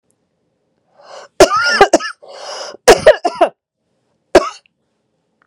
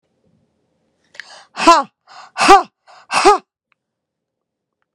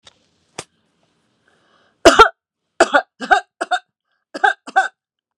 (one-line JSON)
{"cough_length": "5.5 s", "cough_amplitude": 32768, "cough_signal_mean_std_ratio": 0.34, "exhalation_length": "4.9 s", "exhalation_amplitude": 32768, "exhalation_signal_mean_std_ratio": 0.29, "three_cough_length": "5.4 s", "three_cough_amplitude": 32768, "three_cough_signal_mean_std_ratio": 0.28, "survey_phase": "beta (2021-08-13 to 2022-03-07)", "age": "65+", "gender": "Female", "wearing_mask": "No", "symptom_none": true, "smoker_status": "Never smoked", "respiratory_condition_asthma": false, "respiratory_condition_other": false, "recruitment_source": "REACT", "submission_delay": "0 days", "covid_test_result": "Negative", "covid_test_method": "RT-qPCR"}